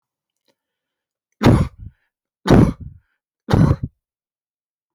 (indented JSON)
{
  "three_cough_length": "4.9 s",
  "three_cough_amplitude": 32565,
  "three_cough_signal_mean_std_ratio": 0.31,
  "survey_phase": "beta (2021-08-13 to 2022-03-07)",
  "age": "65+",
  "gender": "Male",
  "wearing_mask": "No",
  "symptom_none": true,
  "smoker_status": "Ex-smoker",
  "respiratory_condition_asthma": false,
  "respiratory_condition_other": false,
  "recruitment_source": "REACT",
  "submission_delay": "0 days",
  "covid_test_result": "Negative",
  "covid_test_method": "RT-qPCR"
}